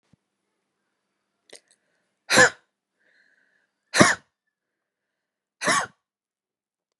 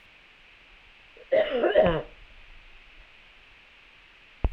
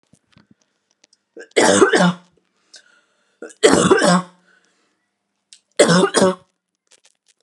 {
  "exhalation_length": "7.0 s",
  "exhalation_amplitude": 32440,
  "exhalation_signal_mean_std_ratio": 0.21,
  "cough_length": "4.5 s",
  "cough_amplitude": 13319,
  "cough_signal_mean_std_ratio": 0.37,
  "three_cough_length": "7.4 s",
  "three_cough_amplitude": 32768,
  "three_cough_signal_mean_std_ratio": 0.38,
  "survey_phase": "alpha (2021-03-01 to 2021-08-12)",
  "age": "18-44",
  "gender": "Female",
  "wearing_mask": "No",
  "symptom_none": true,
  "symptom_onset": "3 days",
  "smoker_status": "Never smoked",
  "respiratory_condition_asthma": true,
  "respiratory_condition_other": false,
  "recruitment_source": "REACT",
  "submission_delay": "1 day",
  "covid_test_result": "Negative",
  "covid_test_method": "RT-qPCR"
}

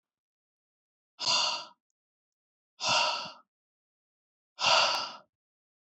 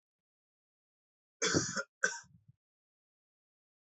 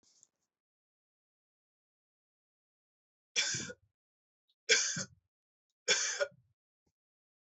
{
  "exhalation_length": "5.9 s",
  "exhalation_amplitude": 9485,
  "exhalation_signal_mean_std_ratio": 0.37,
  "cough_length": "3.9 s",
  "cough_amplitude": 5451,
  "cough_signal_mean_std_ratio": 0.27,
  "three_cough_length": "7.5 s",
  "three_cough_amplitude": 8363,
  "three_cough_signal_mean_std_ratio": 0.27,
  "survey_phase": "alpha (2021-03-01 to 2021-08-12)",
  "age": "18-44",
  "gender": "Male",
  "wearing_mask": "No",
  "symptom_none": true,
  "smoker_status": "Never smoked",
  "respiratory_condition_asthma": false,
  "respiratory_condition_other": false,
  "recruitment_source": "Test and Trace",
  "submission_delay": "1 day",
  "covid_test_result": "Positive",
  "covid_test_method": "RT-qPCR",
  "covid_ct_value": 33.7,
  "covid_ct_gene": "ORF1ab gene"
}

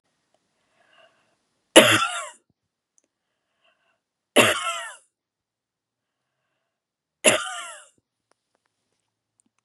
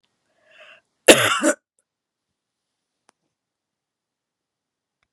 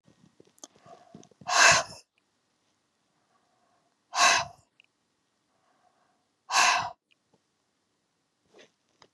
{
  "three_cough_length": "9.6 s",
  "three_cough_amplitude": 32768,
  "three_cough_signal_mean_std_ratio": 0.22,
  "cough_length": "5.1 s",
  "cough_amplitude": 32768,
  "cough_signal_mean_std_ratio": 0.19,
  "exhalation_length": "9.1 s",
  "exhalation_amplitude": 17382,
  "exhalation_signal_mean_std_ratio": 0.26,
  "survey_phase": "beta (2021-08-13 to 2022-03-07)",
  "age": "45-64",
  "gender": "Female",
  "wearing_mask": "No",
  "symptom_sore_throat": true,
  "symptom_fatigue": true,
  "symptom_headache": true,
  "symptom_onset": "3 days",
  "smoker_status": "Never smoked",
  "respiratory_condition_asthma": false,
  "respiratory_condition_other": false,
  "recruitment_source": "Test and Trace",
  "submission_delay": "2 days",
  "covid_test_result": "Positive",
  "covid_test_method": "RT-qPCR",
  "covid_ct_value": 27.6,
  "covid_ct_gene": "ORF1ab gene"
}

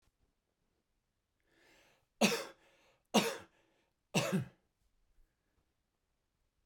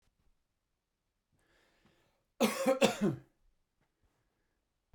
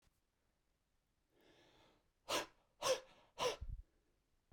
{
  "three_cough_length": "6.7 s",
  "three_cough_amplitude": 7551,
  "three_cough_signal_mean_std_ratio": 0.25,
  "cough_length": "4.9 s",
  "cough_amplitude": 9196,
  "cough_signal_mean_std_ratio": 0.27,
  "exhalation_length": "4.5 s",
  "exhalation_amplitude": 2029,
  "exhalation_signal_mean_std_ratio": 0.31,
  "survey_phase": "beta (2021-08-13 to 2022-03-07)",
  "age": "45-64",
  "gender": "Male",
  "wearing_mask": "No",
  "symptom_none": true,
  "smoker_status": "Never smoked",
  "respiratory_condition_asthma": false,
  "respiratory_condition_other": false,
  "recruitment_source": "REACT",
  "submission_delay": "1 day",
  "covid_test_result": "Negative",
  "covid_test_method": "RT-qPCR"
}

